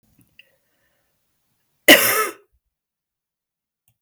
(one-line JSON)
{"cough_length": "4.0 s", "cough_amplitude": 32768, "cough_signal_mean_std_ratio": 0.21, "survey_phase": "beta (2021-08-13 to 2022-03-07)", "age": "45-64", "gender": "Female", "wearing_mask": "No", "symptom_cough_any": true, "symptom_runny_or_blocked_nose": true, "symptom_sore_throat": true, "symptom_abdominal_pain": true, "symptom_fatigue": true, "symptom_fever_high_temperature": true, "symptom_change_to_sense_of_smell_or_taste": true, "smoker_status": "Never smoked", "respiratory_condition_asthma": false, "respiratory_condition_other": false, "recruitment_source": "Test and Trace", "submission_delay": "1 day", "covid_test_result": "Positive", "covid_test_method": "RT-qPCR", "covid_ct_value": 24.3, "covid_ct_gene": "ORF1ab gene"}